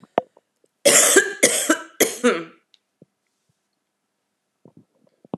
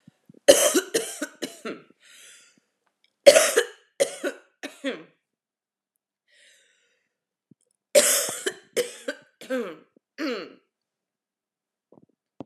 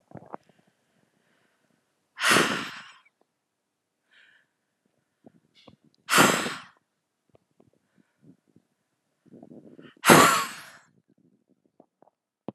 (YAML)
cough_length: 5.4 s
cough_amplitude: 32714
cough_signal_mean_std_ratio: 0.34
three_cough_length: 12.5 s
three_cough_amplitude: 32767
three_cough_signal_mean_std_ratio: 0.28
exhalation_length: 12.5 s
exhalation_amplitude: 31735
exhalation_signal_mean_std_ratio: 0.24
survey_phase: alpha (2021-03-01 to 2021-08-12)
age: 18-44
gender: Female
wearing_mask: 'No'
symptom_cough_any: true
symptom_fatigue: true
symptom_fever_high_temperature: true
symptom_change_to_sense_of_smell_or_taste: true
symptom_loss_of_taste: true
symptom_onset: 2 days
smoker_status: Ex-smoker
respiratory_condition_asthma: false
respiratory_condition_other: false
recruitment_source: Test and Trace
submission_delay: 2 days
covid_test_result: Positive
covid_test_method: ePCR